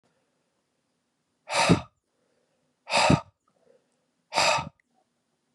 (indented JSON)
{
  "exhalation_length": "5.5 s",
  "exhalation_amplitude": 20388,
  "exhalation_signal_mean_std_ratio": 0.31,
  "survey_phase": "beta (2021-08-13 to 2022-03-07)",
  "age": "18-44",
  "gender": "Male",
  "wearing_mask": "No",
  "symptom_cough_any": true,
  "symptom_runny_or_blocked_nose": true,
  "symptom_shortness_of_breath": true,
  "symptom_sore_throat": true,
  "symptom_abdominal_pain": true,
  "symptom_diarrhoea": true,
  "symptom_fatigue": true,
  "symptom_headache": true,
  "symptom_onset": "3 days",
  "smoker_status": "Ex-smoker",
  "respiratory_condition_asthma": false,
  "respiratory_condition_other": false,
  "recruitment_source": "Test and Trace",
  "submission_delay": "2 days",
  "covid_test_result": "Positive",
  "covid_test_method": "RT-qPCR",
  "covid_ct_value": 20.9,
  "covid_ct_gene": "ORF1ab gene",
  "covid_ct_mean": 21.9,
  "covid_viral_load": "67000 copies/ml",
  "covid_viral_load_category": "Low viral load (10K-1M copies/ml)"
}